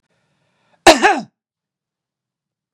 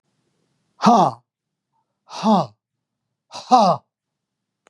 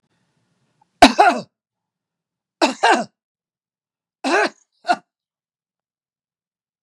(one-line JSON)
{"cough_length": "2.7 s", "cough_amplitude": 32768, "cough_signal_mean_std_ratio": 0.23, "exhalation_length": "4.7 s", "exhalation_amplitude": 31192, "exhalation_signal_mean_std_ratio": 0.33, "three_cough_length": "6.8 s", "three_cough_amplitude": 32768, "three_cough_signal_mean_std_ratio": 0.26, "survey_phase": "beta (2021-08-13 to 2022-03-07)", "age": "65+", "gender": "Male", "wearing_mask": "No", "symptom_none": true, "smoker_status": "Ex-smoker", "respiratory_condition_asthma": false, "respiratory_condition_other": false, "recruitment_source": "REACT", "submission_delay": "1 day", "covid_test_result": "Negative", "covid_test_method": "RT-qPCR", "influenza_a_test_result": "Negative", "influenza_b_test_result": "Negative"}